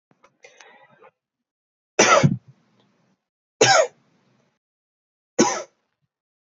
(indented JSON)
{
  "three_cough_length": "6.5 s",
  "three_cough_amplitude": 27460,
  "three_cough_signal_mean_std_ratio": 0.28,
  "survey_phase": "alpha (2021-03-01 to 2021-08-12)",
  "age": "18-44",
  "gender": "Male",
  "wearing_mask": "No",
  "symptom_none": true,
  "smoker_status": "Never smoked",
  "respiratory_condition_asthma": false,
  "respiratory_condition_other": false,
  "recruitment_source": "REACT",
  "submission_delay": "1 day",
  "covid_test_result": "Negative",
  "covid_test_method": "RT-qPCR"
}